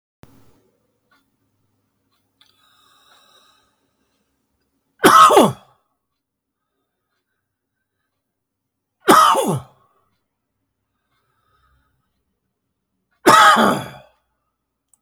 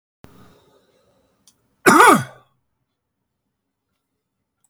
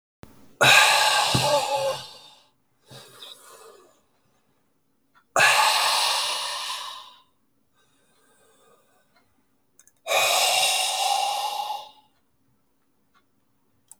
{
  "three_cough_length": "15.0 s",
  "three_cough_amplitude": 32768,
  "three_cough_signal_mean_std_ratio": 0.25,
  "cough_length": "4.7 s",
  "cough_amplitude": 32768,
  "cough_signal_mean_std_ratio": 0.23,
  "exhalation_length": "14.0 s",
  "exhalation_amplitude": 25587,
  "exhalation_signal_mean_std_ratio": 0.47,
  "survey_phase": "beta (2021-08-13 to 2022-03-07)",
  "age": "65+",
  "gender": "Male",
  "wearing_mask": "No",
  "symptom_none": true,
  "smoker_status": "Ex-smoker",
  "respiratory_condition_asthma": false,
  "respiratory_condition_other": false,
  "recruitment_source": "REACT",
  "submission_delay": "2 days",
  "covid_test_result": "Negative",
  "covid_test_method": "RT-qPCR",
  "influenza_a_test_result": "Negative",
  "influenza_b_test_result": "Negative"
}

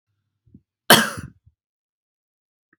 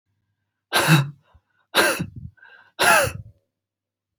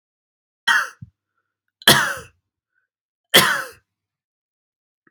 {
  "cough_length": "2.8 s",
  "cough_amplitude": 32768,
  "cough_signal_mean_std_ratio": 0.19,
  "exhalation_length": "4.2 s",
  "exhalation_amplitude": 24028,
  "exhalation_signal_mean_std_ratio": 0.39,
  "three_cough_length": "5.1 s",
  "three_cough_amplitude": 32767,
  "three_cough_signal_mean_std_ratio": 0.28,
  "survey_phase": "beta (2021-08-13 to 2022-03-07)",
  "age": "18-44",
  "gender": "Male",
  "wearing_mask": "No",
  "symptom_none": true,
  "smoker_status": "Never smoked",
  "respiratory_condition_asthma": false,
  "respiratory_condition_other": false,
  "recruitment_source": "REACT",
  "submission_delay": "2 days",
  "covid_test_result": "Negative",
  "covid_test_method": "RT-qPCR"
}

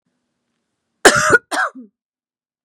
{
  "cough_length": "2.6 s",
  "cough_amplitude": 32768,
  "cough_signal_mean_std_ratio": 0.31,
  "survey_phase": "beta (2021-08-13 to 2022-03-07)",
  "age": "18-44",
  "gender": "Female",
  "wearing_mask": "No",
  "symptom_runny_or_blocked_nose": true,
  "symptom_sore_throat": true,
  "symptom_headache": true,
  "smoker_status": "Never smoked",
  "respiratory_condition_asthma": false,
  "respiratory_condition_other": false,
  "recruitment_source": "Test and Trace",
  "submission_delay": "2 days",
  "covid_test_result": "Positive",
  "covid_test_method": "RT-qPCR"
}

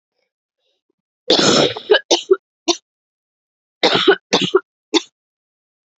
{
  "three_cough_length": "6.0 s",
  "three_cough_amplitude": 31329,
  "three_cough_signal_mean_std_ratio": 0.37,
  "survey_phase": "beta (2021-08-13 to 2022-03-07)",
  "age": "18-44",
  "gender": "Female",
  "wearing_mask": "No",
  "symptom_cough_any": true,
  "symptom_runny_or_blocked_nose": true,
  "symptom_shortness_of_breath": true,
  "symptom_abdominal_pain": true,
  "symptom_diarrhoea": true,
  "symptom_fatigue": true,
  "symptom_headache": true,
  "symptom_change_to_sense_of_smell_or_taste": true,
  "symptom_loss_of_taste": true,
  "symptom_onset": "2 days",
  "smoker_status": "Ex-smoker",
  "respiratory_condition_asthma": false,
  "respiratory_condition_other": false,
  "recruitment_source": "Test and Trace",
  "submission_delay": "1 day",
  "covid_test_result": "Positive",
  "covid_test_method": "RT-qPCR",
  "covid_ct_value": 15.3,
  "covid_ct_gene": "ORF1ab gene",
  "covid_ct_mean": 15.4,
  "covid_viral_load": "8600000 copies/ml",
  "covid_viral_load_category": "High viral load (>1M copies/ml)"
}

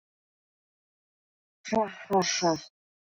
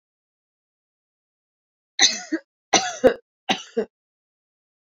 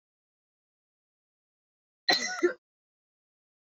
{
  "exhalation_length": "3.2 s",
  "exhalation_amplitude": 6540,
  "exhalation_signal_mean_std_ratio": 0.38,
  "three_cough_length": "4.9 s",
  "three_cough_amplitude": 26179,
  "three_cough_signal_mean_std_ratio": 0.26,
  "cough_length": "3.7 s",
  "cough_amplitude": 11252,
  "cough_signal_mean_std_ratio": 0.23,
  "survey_phase": "beta (2021-08-13 to 2022-03-07)",
  "age": "18-44",
  "gender": "Female",
  "wearing_mask": "No",
  "symptom_none": true,
  "smoker_status": "Never smoked",
  "respiratory_condition_asthma": false,
  "respiratory_condition_other": false,
  "recruitment_source": "REACT",
  "submission_delay": "1 day",
  "covid_test_result": "Negative",
  "covid_test_method": "RT-qPCR"
}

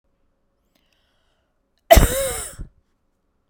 {
  "cough_length": "3.5 s",
  "cough_amplitude": 32768,
  "cough_signal_mean_std_ratio": 0.24,
  "survey_phase": "beta (2021-08-13 to 2022-03-07)",
  "age": "45-64",
  "gender": "Female",
  "wearing_mask": "No",
  "symptom_none": true,
  "symptom_onset": "8 days",
  "smoker_status": "Never smoked",
  "respiratory_condition_asthma": false,
  "respiratory_condition_other": false,
  "recruitment_source": "REACT",
  "submission_delay": "2 days",
  "covid_test_result": "Negative",
  "covid_test_method": "RT-qPCR"
}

